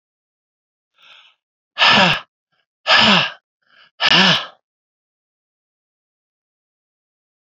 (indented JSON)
{
  "exhalation_length": "7.4 s",
  "exhalation_amplitude": 32768,
  "exhalation_signal_mean_std_ratio": 0.33,
  "survey_phase": "beta (2021-08-13 to 2022-03-07)",
  "age": "65+",
  "gender": "Male",
  "wearing_mask": "No",
  "symptom_cough_any": true,
  "symptom_runny_or_blocked_nose": true,
  "symptom_loss_of_taste": true,
  "symptom_onset": "4 days",
  "smoker_status": "Ex-smoker",
  "respiratory_condition_asthma": false,
  "respiratory_condition_other": false,
  "recruitment_source": "Test and Trace",
  "submission_delay": "2 days",
  "covid_test_result": "Positive",
  "covid_test_method": "RT-qPCR",
  "covid_ct_value": 13.5,
  "covid_ct_gene": "ORF1ab gene",
  "covid_ct_mean": 13.7,
  "covid_viral_load": "31000000 copies/ml",
  "covid_viral_load_category": "High viral load (>1M copies/ml)"
}